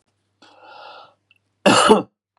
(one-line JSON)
{"cough_length": "2.4 s", "cough_amplitude": 32767, "cough_signal_mean_std_ratio": 0.32, "survey_phase": "beta (2021-08-13 to 2022-03-07)", "age": "45-64", "gender": "Male", "wearing_mask": "No", "symptom_cough_any": true, "symptom_runny_or_blocked_nose": true, "symptom_sore_throat": true, "smoker_status": "Ex-smoker", "respiratory_condition_asthma": false, "respiratory_condition_other": false, "recruitment_source": "REACT", "submission_delay": "4 days", "covid_test_result": "Negative", "covid_test_method": "RT-qPCR"}